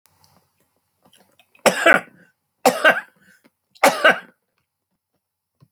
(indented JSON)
{
  "three_cough_length": "5.7 s",
  "three_cough_amplitude": 29110,
  "three_cough_signal_mean_std_ratio": 0.28,
  "survey_phase": "alpha (2021-03-01 to 2021-08-12)",
  "age": "65+",
  "gender": "Male",
  "wearing_mask": "No",
  "symptom_none": true,
  "smoker_status": "Ex-smoker",
  "respiratory_condition_asthma": false,
  "respiratory_condition_other": false,
  "recruitment_source": "REACT",
  "submission_delay": "3 days",
  "covid_test_result": "Negative",
  "covid_test_method": "RT-qPCR"
}